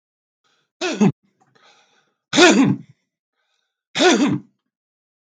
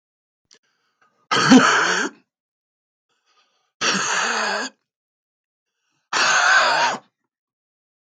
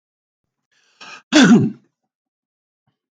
{"three_cough_length": "5.3 s", "three_cough_amplitude": 32766, "three_cough_signal_mean_std_ratio": 0.37, "exhalation_length": "8.2 s", "exhalation_amplitude": 32768, "exhalation_signal_mean_std_ratio": 0.43, "cough_length": "3.2 s", "cough_amplitude": 32768, "cough_signal_mean_std_ratio": 0.28, "survey_phase": "beta (2021-08-13 to 2022-03-07)", "age": "45-64", "gender": "Male", "wearing_mask": "No", "symptom_cough_any": true, "smoker_status": "Never smoked", "respiratory_condition_asthma": true, "respiratory_condition_other": false, "recruitment_source": "REACT", "submission_delay": "2 days", "covid_test_result": "Negative", "covid_test_method": "RT-qPCR", "influenza_a_test_result": "Negative", "influenza_b_test_result": "Negative"}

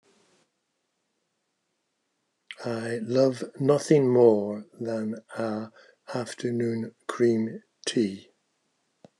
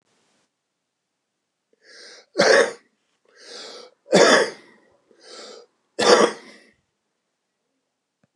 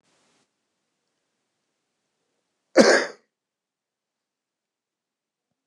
{"exhalation_length": "9.2 s", "exhalation_amplitude": 16565, "exhalation_signal_mean_std_ratio": 0.47, "three_cough_length": "8.4 s", "three_cough_amplitude": 28864, "three_cough_signal_mean_std_ratio": 0.29, "cough_length": "5.7 s", "cough_amplitude": 29204, "cough_signal_mean_std_ratio": 0.17, "survey_phase": "beta (2021-08-13 to 2022-03-07)", "age": "65+", "gender": "Male", "wearing_mask": "No", "symptom_none": true, "smoker_status": "Ex-smoker", "respiratory_condition_asthma": true, "respiratory_condition_other": false, "recruitment_source": "REACT", "submission_delay": "2 days", "covid_test_result": "Negative", "covid_test_method": "RT-qPCR"}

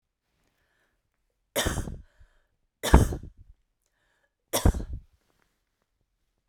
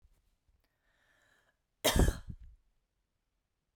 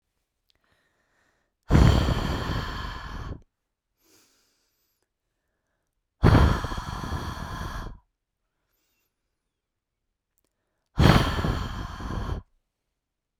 {"three_cough_length": "6.5 s", "three_cough_amplitude": 27618, "three_cough_signal_mean_std_ratio": 0.25, "cough_length": "3.8 s", "cough_amplitude": 6754, "cough_signal_mean_std_ratio": 0.23, "exhalation_length": "13.4 s", "exhalation_amplitude": 25027, "exhalation_signal_mean_std_ratio": 0.36, "survey_phase": "beta (2021-08-13 to 2022-03-07)", "age": "18-44", "gender": "Female", "wearing_mask": "No", "symptom_none": true, "symptom_onset": "6 days", "smoker_status": "Ex-smoker", "respiratory_condition_asthma": true, "respiratory_condition_other": false, "recruitment_source": "REACT", "submission_delay": "1 day", "covid_test_result": "Negative", "covid_test_method": "RT-qPCR"}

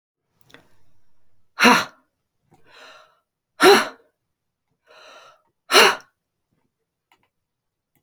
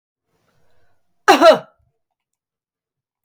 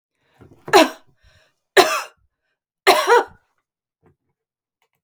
{"exhalation_length": "8.0 s", "exhalation_amplitude": 30107, "exhalation_signal_mean_std_ratio": 0.24, "cough_length": "3.2 s", "cough_amplitude": 32249, "cough_signal_mean_std_ratio": 0.24, "three_cough_length": "5.0 s", "three_cough_amplitude": 31335, "three_cough_signal_mean_std_ratio": 0.29, "survey_phase": "alpha (2021-03-01 to 2021-08-12)", "age": "45-64", "gender": "Female", "wearing_mask": "No", "symptom_none": true, "smoker_status": "Never smoked", "respiratory_condition_asthma": false, "respiratory_condition_other": false, "recruitment_source": "REACT", "submission_delay": "7 days", "covid_test_result": "Negative", "covid_test_method": "RT-qPCR"}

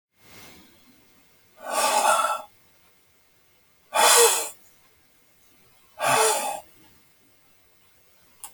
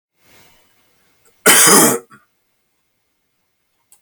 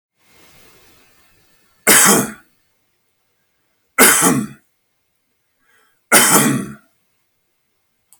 {"exhalation_length": "8.5 s", "exhalation_amplitude": 26565, "exhalation_signal_mean_std_ratio": 0.38, "cough_length": "4.0 s", "cough_amplitude": 32768, "cough_signal_mean_std_ratio": 0.3, "three_cough_length": "8.2 s", "three_cough_amplitude": 32768, "three_cough_signal_mean_std_ratio": 0.33, "survey_phase": "alpha (2021-03-01 to 2021-08-12)", "age": "65+", "gender": "Male", "wearing_mask": "No", "symptom_none": true, "smoker_status": "Never smoked", "respiratory_condition_asthma": false, "respiratory_condition_other": false, "recruitment_source": "REACT", "submission_delay": "2 days", "covid_test_result": "Negative", "covid_test_method": "RT-qPCR"}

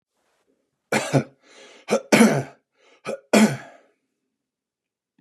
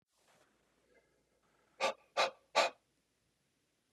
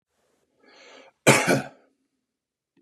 {"three_cough_length": "5.2 s", "three_cough_amplitude": 29385, "three_cough_signal_mean_std_ratio": 0.32, "exhalation_length": "3.9 s", "exhalation_amplitude": 4638, "exhalation_signal_mean_std_ratio": 0.25, "cough_length": "2.8 s", "cough_amplitude": 28601, "cough_signal_mean_std_ratio": 0.26, "survey_phase": "beta (2021-08-13 to 2022-03-07)", "age": "18-44", "gender": "Male", "wearing_mask": "No", "symptom_sore_throat": true, "smoker_status": "Ex-smoker", "respiratory_condition_asthma": false, "respiratory_condition_other": false, "recruitment_source": "REACT", "submission_delay": "1 day", "covid_test_result": "Negative", "covid_test_method": "RT-qPCR", "influenza_a_test_result": "Negative", "influenza_b_test_result": "Negative"}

